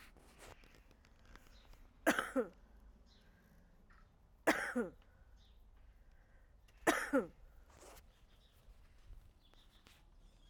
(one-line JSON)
{"three_cough_length": "10.5 s", "three_cough_amplitude": 4767, "three_cough_signal_mean_std_ratio": 0.31, "survey_phase": "alpha (2021-03-01 to 2021-08-12)", "age": "45-64", "gender": "Female", "wearing_mask": "No", "symptom_cough_any": true, "symptom_diarrhoea": true, "symptom_fatigue": true, "symptom_change_to_sense_of_smell_or_taste": true, "symptom_loss_of_taste": true, "smoker_status": "Ex-smoker", "respiratory_condition_asthma": false, "respiratory_condition_other": false, "recruitment_source": "Test and Trace", "submission_delay": "0 days", "covid_test_result": "Negative", "covid_test_method": "LFT"}